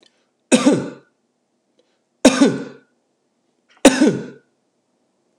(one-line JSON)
{"cough_length": "5.4 s", "cough_amplitude": 32768, "cough_signal_mean_std_ratio": 0.31, "survey_phase": "alpha (2021-03-01 to 2021-08-12)", "age": "45-64", "gender": "Male", "wearing_mask": "No", "symptom_none": true, "smoker_status": "Ex-smoker", "respiratory_condition_asthma": false, "respiratory_condition_other": false, "recruitment_source": "REACT", "submission_delay": "2 days", "covid_test_result": "Negative", "covid_test_method": "RT-qPCR"}